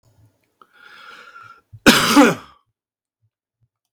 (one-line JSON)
{"cough_length": "3.9 s", "cough_amplitude": 32768, "cough_signal_mean_std_ratio": 0.29, "survey_phase": "beta (2021-08-13 to 2022-03-07)", "age": "45-64", "gender": "Male", "wearing_mask": "No", "symptom_none": true, "smoker_status": "Never smoked", "respiratory_condition_asthma": false, "respiratory_condition_other": false, "recruitment_source": "REACT", "submission_delay": "1 day", "covid_test_result": "Negative", "covid_test_method": "RT-qPCR"}